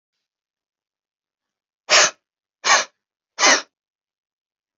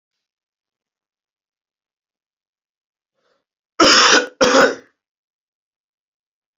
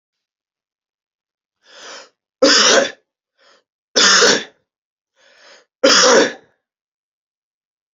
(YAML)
exhalation_length: 4.8 s
exhalation_amplitude: 29320
exhalation_signal_mean_std_ratio: 0.27
cough_length: 6.6 s
cough_amplitude: 32767
cough_signal_mean_std_ratio: 0.28
three_cough_length: 7.9 s
three_cough_amplitude: 32768
three_cough_signal_mean_std_ratio: 0.35
survey_phase: beta (2021-08-13 to 2022-03-07)
age: 18-44
gender: Male
wearing_mask: 'No'
symptom_cough_any: true
smoker_status: Never smoked
respiratory_condition_asthma: true
respiratory_condition_other: false
recruitment_source: Test and Trace
submission_delay: 2 days
covid_test_result: Positive
covid_test_method: LFT